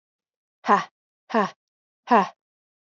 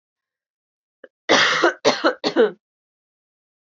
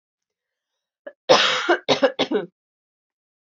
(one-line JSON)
{"exhalation_length": "3.0 s", "exhalation_amplitude": 23546, "exhalation_signal_mean_std_ratio": 0.29, "three_cough_length": "3.7 s", "three_cough_amplitude": 29714, "three_cough_signal_mean_std_ratio": 0.39, "cough_length": "3.5 s", "cough_amplitude": 32767, "cough_signal_mean_std_ratio": 0.37, "survey_phase": "alpha (2021-03-01 to 2021-08-12)", "age": "18-44", "gender": "Female", "wearing_mask": "No", "symptom_cough_any": true, "symptom_fatigue": true, "symptom_fever_high_temperature": true, "symptom_headache": true, "symptom_change_to_sense_of_smell_or_taste": true, "symptom_onset": "4 days", "smoker_status": "Never smoked", "respiratory_condition_asthma": true, "respiratory_condition_other": false, "recruitment_source": "Test and Trace", "submission_delay": "2 days", "covid_test_result": "Positive", "covid_test_method": "RT-qPCR", "covid_ct_value": 19.2, "covid_ct_gene": "ORF1ab gene", "covid_ct_mean": 20.2, "covid_viral_load": "240000 copies/ml", "covid_viral_load_category": "Low viral load (10K-1M copies/ml)"}